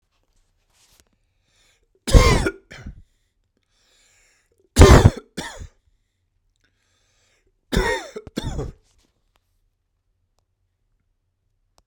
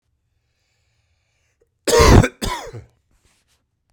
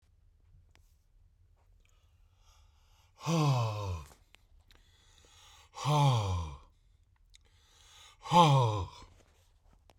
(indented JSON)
{
  "three_cough_length": "11.9 s",
  "three_cough_amplitude": 32768,
  "three_cough_signal_mean_std_ratio": 0.22,
  "cough_length": "3.9 s",
  "cough_amplitude": 32768,
  "cough_signal_mean_std_ratio": 0.28,
  "exhalation_length": "10.0 s",
  "exhalation_amplitude": 10708,
  "exhalation_signal_mean_std_ratio": 0.38,
  "survey_phase": "beta (2021-08-13 to 2022-03-07)",
  "age": "45-64",
  "gender": "Male",
  "wearing_mask": "No",
  "symptom_none": true,
  "smoker_status": "Never smoked",
  "respiratory_condition_asthma": false,
  "respiratory_condition_other": false,
  "recruitment_source": "REACT",
  "submission_delay": "0 days",
  "covid_test_result": "Negative",
  "covid_test_method": "RT-qPCR"
}